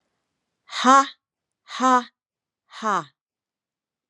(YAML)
exhalation_length: 4.1 s
exhalation_amplitude: 24961
exhalation_signal_mean_std_ratio: 0.32
survey_phase: beta (2021-08-13 to 2022-03-07)
age: 45-64
gender: Female
wearing_mask: 'No'
symptom_none: true
smoker_status: Never smoked
respiratory_condition_asthma: false
respiratory_condition_other: false
recruitment_source: REACT
submission_delay: 2 days
covid_test_result: Negative
covid_test_method: RT-qPCR